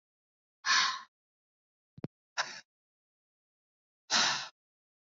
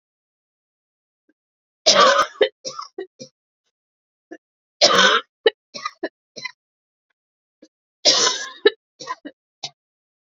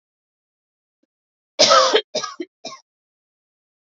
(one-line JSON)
{"exhalation_length": "5.1 s", "exhalation_amplitude": 6351, "exhalation_signal_mean_std_ratio": 0.3, "three_cough_length": "10.2 s", "three_cough_amplitude": 32254, "three_cough_signal_mean_std_ratio": 0.3, "cough_length": "3.8 s", "cough_amplitude": 30496, "cough_signal_mean_std_ratio": 0.29, "survey_phase": "beta (2021-08-13 to 2022-03-07)", "age": "18-44", "gender": "Female", "wearing_mask": "No", "symptom_cough_any": true, "symptom_new_continuous_cough": true, "symptom_runny_or_blocked_nose": true, "symptom_sore_throat": true, "smoker_status": "Never smoked", "respiratory_condition_asthma": false, "respiratory_condition_other": false, "recruitment_source": "Test and Trace", "submission_delay": "2 days", "covid_test_result": "Positive", "covid_test_method": "RT-qPCR", "covid_ct_value": 22.7, "covid_ct_gene": "ORF1ab gene"}